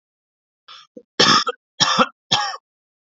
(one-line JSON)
{"three_cough_length": "3.2 s", "three_cough_amplitude": 32767, "three_cough_signal_mean_std_ratio": 0.38, "survey_phase": "alpha (2021-03-01 to 2021-08-12)", "age": "18-44", "gender": "Male", "wearing_mask": "No", "symptom_cough_any": true, "symptom_fatigue": true, "symptom_fever_high_temperature": true, "symptom_headache": true, "symptom_onset": "2 days", "smoker_status": "Never smoked", "respiratory_condition_asthma": true, "respiratory_condition_other": false, "recruitment_source": "Test and Trace", "submission_delay": "1 day", "covid_test_result": "Positive", "covid_test_method": "RT-qPCR"}